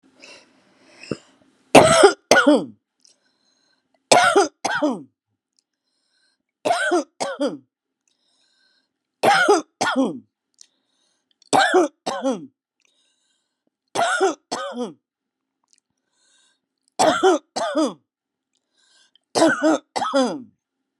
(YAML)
cough_length: 21.0 s
cough_amplitude: 32768
cough_signal_mean_std_ratio: 0.38
survey_phase: beta (2021-08-13 to 2022-03-07)
age: 65+
gender: Female
wearing_mask: 'No'
symptom_none: true
symptom_onset: 13 days
smoker_status: Never smoked
respiratory_condition_asthma: false
respiratory_condition_other: false
recruitment_source: REACT
submission_delay: 7 days
covid_test_result: Negative
covid_test_method: RT-qPCR